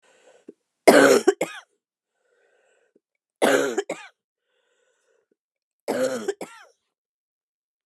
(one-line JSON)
{"three_cough_length": "7.9 s", "three_cough_amplitude": 32749, "three_cough_signal_mean_std_ratio": 0.28, "survey_phase": "beta (2021-08-13 to 2022-03-07)", "age": "45-64", "gender": "Female", "wearing_mask": "No", "symptom_cough_any": true, "symptom_runny_or_blocked_nose": true, "symptom_sore_throat": true, "symptom_diarrhoea": true, "symptom_fatigue": true, "symptom_headache": true, "symptom_change_to_sense_of_smell_or_taste": true, "symptom_loss_of_taste": true, "smoker_status": "Ex-smoker", "respiratory_condition_asthma": false, "respiratory_condition_other": false, "recruitment_source": "Test and Trace", "submission_delay": "2 days", "covid_test_result": "Positive", "covid_test_method": "RT-qPCR", "covid_ct_value": 18.4, "covid_ct_gene": "ORF1ab gene", "covid_ct_mean": 18.8, "covid_viral_load": "660000 copies/ml", "covid_viral_load_category": "Low viral load (10K-1M copies/ml)"}